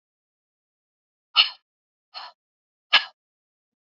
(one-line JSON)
{"exhalation_length": "3.9 s", "exhalation_amplitude": 24628, "exhalation_signal_mean_std_ratio": 0.17, "survey_phase": "beta (2021-08-13 to 2022-03-07)", "age": "45-64", "gender": "Female", "wearing_mask": "No", "symptom_none": true, "smoker_status": "Never smoked", "respiratory_condition_asthma": true, "respiratory_condition_other": false, "recruitment_source": "REACT", "submission_delay": "1 day", "covid_test_result": "Negative", "covid_test_method": "RT-qPCR", "influenza_a_test_result": "Negative", "influenza_b_test_result": "Negative"}